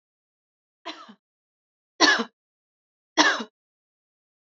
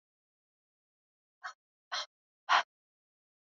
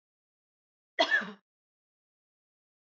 {"three_cough_length": "4.5 s", "three_cough_amplitude": 26670, "three_cough_signal_mean_std_ratio": 0.25, "exhalation_length": "3.6 s", "exhalation_amplitude": 7857, "exhalation_signal_mean_std_ratio": 0.19, "cough_length": "2.8 s", "cough_amplitude": 7910, "cough_signal_mean_std_ratio": 0.23, "survey_phase": "beta (2021-08-13 to 2022-03-07)", "age": "45-64", "gender": "Female", "wearing_mask": "No", "symptom_cough_any": true, "symptom_runny_or_blocked_nose": true, "symptom_fatigue": true, "symptom_onset": "5 days", "smoker_status": "Never smoked", "respiratory_condition_asthma": false, "respiratory_condition_other": false, "recruitment_source": "Test and Trace", "submission_delay": "2 days", "covid_test_result": "Positive", "covid_test_method": "RT-qPCR", "covid_ct_value": 20.9, "covid_ct_gene": "ORF1ab gene"}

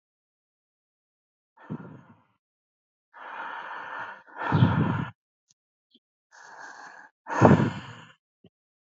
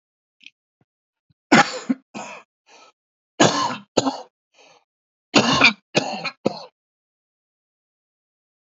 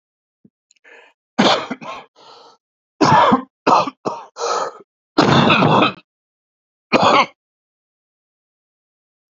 {"exhalation_length": "8.9 s", "exhalation_amplitude": 26250, "exhalation_signal_mean_std_ratio": 0.31, "three_cough_length": "8.8 s", "three_cough_amplitude": 29822, "three_cough_signal_mean_std_ratio": 0.3, "cough_length": "9.3 s", "cough_amplitude": 32767, "cough_signal_mean_std_ratio": 0.41, "survey_phase": "alpha (2021-03-01 to 2021-08-12)", "age": "45-64", "gender": "Male", "wearing_mask": "No", "symptom_cough_any": true, "symptom_shortness_of_breath": true, "symptom_diarrhoea": true, "symptom_fatigue": true, "symptom_headache": true, "smoker_status": "Current smoker (1 to 10 cigarettes per day)", "respiratory_condition_asthma": false, "respiratory_condition_other": true, "recruitment_source": "REACT", "submission_delay": "2 days", "covid_test_result": "Negative", "covid_test_method": "RT-qPCR"}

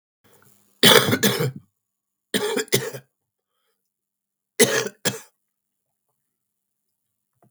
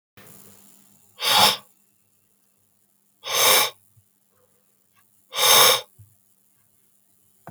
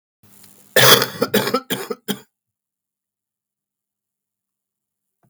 {"three_cough_length": "7.5 s", "three_cough_amplitude": 32768, "three_cough_signal_mean_std_ratio": 0.3, "exhalation_length": "7.5 s", "exhalation_amplitude": 27873, "exhalation_signal_mean_std_ratio": 0.32, "cough_length": "5.3 s", "cough_amplitude": 32768, "cough_signal_mean_std_ratio": 0.28, "survey_phase": "beta (2021-08-13 to 2022-03-07)", "age": "45-64", "gender": "Male", "wearing_mask": "No", "symptom_cough_any": true, "symptom_runny_or_blocked_nose": true, "symptom_sore_throat": true, "symptom_fever_high_temperature": true, "symptom_headache": true, "symptom_change_to_sense_of_smell_or_taste": true, "symptom_onset": "6 days", "smoker_status": "Ex-smoker", "respiratory_condition_asthma": false, "respiratory_condition_other": false, "recruitment_source": "Test and Trace", "submission_delay": "1 day", "covid_test_result": "Negative", "covid_test_method": "RT-qPCR"}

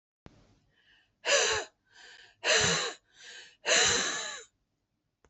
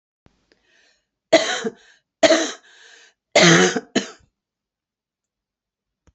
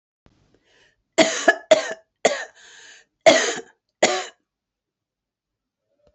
{"exhalation_length": "5.3 s", "exhalation_amplitude": 8991, "exhalation_signal_mean_std_ratio": 0.45, "three_cough_length": "6.1 s", "three_cough_amplitude": 28465, "three_cough_signal_mean_std_ratio": 0.31, "cough_length": "6.1 s", "cough_amplitude": 28223, "cough_signal_mean_std_ratio": 0.3, "survey_phase": "beta (2021-08-13 to 2022-03-07)", "age": "45-64", "gender": "Female", "wearing_mask": "No", "symptom_none": true, "smoker_status": "Ex-smoker", "respiratory_condition_asthma": false, "respiratory_condition_other": false, "recruitment_source": "REACT", "submission_delay": "2 days", "covid_test_result": "Negative", "covid_test_method": "RT-qPCR"}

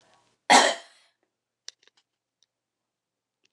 {"cough_length": "3.5 s", "cough_amplitude": 21835, "cough_signal_mean_std_ratio": 0.2, "survey_phase": "beta (2021-08-13 to 2022-03-07)", "age": "65+", "gender": "Female", "wearing_mask": "No", "symptom_none": true, "smoker_status": "Never smoked", "respiratory_condition_asthma": true, "respiratory_condition_other": false, "recruitment_source": "REACT", "submission_delay": "10 days", "covid_test_result": "Negative", "covid_test_method": "RT-qPCR"}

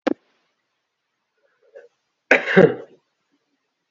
{"cough_length": "3.9 s", "cough_amplitude": 29890, "cough_signal_mean_std_ratio": 0.23, "survey_phase": "beta (2021-08-13 to 2022-03-07)", "age": "18-44", "gender": "Male", "wearing_mask": "No", "symptom_cough_any": true, "symptom_new_continuous_cough": true, "symptom_runny_or_blocked_nose": true, "symptom_onset": "14 days", "smoker_status": "Never smoked", "respiratory_condition_asthma": false, "respiratory_condition_other": false, "recruitment_source": "Test and Trace", "submission_delay": "1 day", "covid_test_result": "Positive", "covid_test_method": "RT-qPCR"}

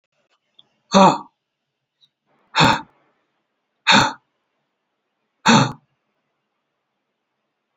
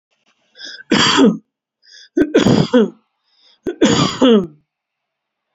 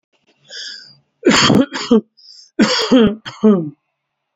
{"exhalation_length": "7.8 s", "exhalation_amplitude": 30668, "exhalation_signal_mean_std_ratio": 0.27, "three_cough_length": "5.5 s", "three_cough_amplitude": 30267, "three_cough_signal_mean_std_ratio": 0.46, "cough_length": "4.4 s", "cough_amplitude": 32767, "cough_signal_mean_std_ratio": 0.48, "survey_phase": "beta (2021-08-13 to 2022-03-07)", "age": "45-64", "gender": "Male", "wearing_mask": "No", "symptom_none": true, "smoker_status": "Never smoked", "respiratory_condition_asthma": false, "respiratory_condition_other": false, "recruitment_source": "REACT", "submission_delay": "2 days", "covid_test_result": "Negative", "covid_test_method": "RT-qPCR", "influenza_a_test_result": "Negative", "influenza_b_test_result": "Negative"}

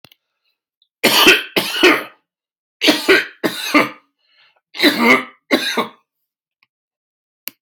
{"three_cough_length": "7.6 s", "three_cough_amplitude": 32767, "three_cough_signal_mean_std_ratio": 0.42, "survey_phase": "beta (2021-08-13 to 2022-03-07)", "age": "45-64", "gender": "Male", "wearing_mask": "No", "symptom_none": true, "smoker_status": "Ex-smoker", "respiratory_condition_asthma": false, "respiratory_condition_other": false, "recruitment_source": "REACT", "submission_delay": "0 days", "covid_test_result": "Negative", "covid_test_method": "RT-qPCR"}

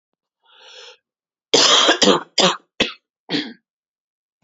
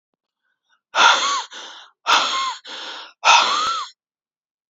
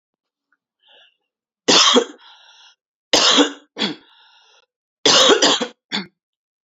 {"cough_length": "4.4 s", "cough_amplitude": 30253, "cough_signal_mean_std_ratio": 0.39, "exhalation_length": "4.7 s", "exhalation_amplitude": 31976, "exhalation_signal_mean_std_ratio": 0.48, "three_cough_length": "6.7 s", "three_cough_amplitude": 32768, "three_cough_signal_mean_std_ratio": 0.39, "survey_phase": "beta (2021-08-13 to 2022-03-07)", "age": "18-44", "gender": "Female", "wearing_mask": "No", "symptom_cough_any": true, "symptom_shortness_of_breath": true, "symptom_sore_throat": true, "symptom_headache": true, "smoker_status": "Ex-smoker", "respiratory_condition_asthma": false, "respiratory_condition_other": false, "recruitment_source": "Test and Trace", "submission_delay": "1 day", "covid_test_result": "Positive", "covid_test_method": "RT-qPCR", "covid_ct_value": 27.9, "covid_ct_gene": "N gene"}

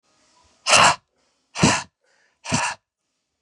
{"exhalation_length": "3.4 s", "exhalation_amplitude": 30636, "exhalation_signal_mean_std_ratio": 0.35, "survey_phase": "beta (2021-08-13 to 2022-03-07)", "age": "45-64", "gender": "Male", "wearing_mask": "No", "symptom_cough_any": true, "symptom_runny_or_blocked_nose": true, "symptom_sore_throat": true, "symptom_headache": true, "smoker_status": "Never smoked", "respiratory_condition_asthma": false, "respiratory_condition_other": false, "recruitment_source": "Test and Trace", "submission_delay": "1 day", "covid_test_result": "Positive", "covid_test_method": "RT-qPCR", "covid_ct_value": 18.1, "covid_ct_gene": "ORF1ab gene", "covid_ct_mean": 18.6, "covid_viral_load": "810000 copies/ml", "covid_viral_load_category": "Low viral load (10K-1M copies/ml)"}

